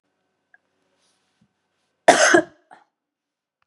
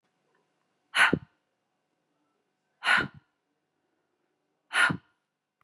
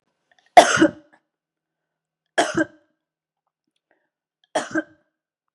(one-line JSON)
{"cough_length": "3.7 s", "cough_amplitude": 32768, "cough_signal_mean_std_ratio": 0.23, "exhalation_length": "5.6 s", "exhalation_amplitude": 11860, "exhalation_signal_mean_std_ratio": 0.26, "three_cough_length": "5.5 s", "three_cough_amplitude": 32768, "three_cough_signal_mean_std_ratio": 0.23, "survey_phase": "beta (2021-08-13 to 2022-03-07)", "age": "45-64", "gender": "Female", "wearing_mask": "No", "symptom_other": true, "smoker_status": "Never smoked", "respiratory_condition_asthma": false, "respiratory_condition_other": false, "recruitment_source": "REACT", "submission_delay": "2 days", "covid_test_result": "Negative", "covid_test_method": "RT-qPCR", "influenza_a_test_result": "Negative", "influenza_b_test_result": "Negative"}